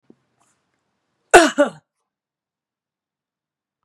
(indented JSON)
{
  "cough_length": "3.8 s",
  "cough_amplitude": 32768,
  "cough_signal_mean_std_ratio": 0.19,
  "survey_phase": "beta (2021-08-13 to 2022-03-07)",
  "age": "65+",
  "gender": "Female",
  "wearing_mask": "No",
  "symptom_none": true,
  "smoker_status": "Never smoked",
  "respiratory_condition_asthma": false,
  "respiratory_condition_other": false,
  "recruitment_source": "REACT",
  "submission_delay": "1 day",
  "covid_test_result": "Negative",
  "covid_test_method": "RT-qPCR",
  "influenza_a_test_result": "Negative",
  "influenza_b_test_result": "Negative"
}